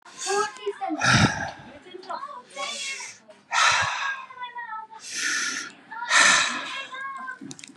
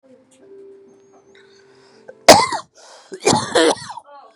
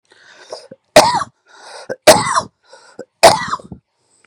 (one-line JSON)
{"exhalation_length": "7.8 s", "exhalation_amplitude": 20468, "exhalation_signal_mean_std_ratio": 0.6, "cough_length": "4.4 s", "cough_amplitude": 32768, "cough_signal_mean_std_ratio": 0.31, "three_cough_length": "4.3 s", "three_cough_amplitude": 32768, "three_cough_signal_mean_std_ratio": 0.34, "survey_phase": "beta (2021-08-13 to 2022-03-07)", "age": "18-44", "gender": "Male", "wearing_mask": "No", "symptom_none": true, "smoker_status": "Current smoker (1 to 10 cigarettes per day)", "respiratory_condition_asthma": false, "respiratory_condition_other": false, "recruitment_source": "REACT", "submission_delay": "3 days", "covid_test_result": "Negative", "covid_test_method": "RT-qPCR"}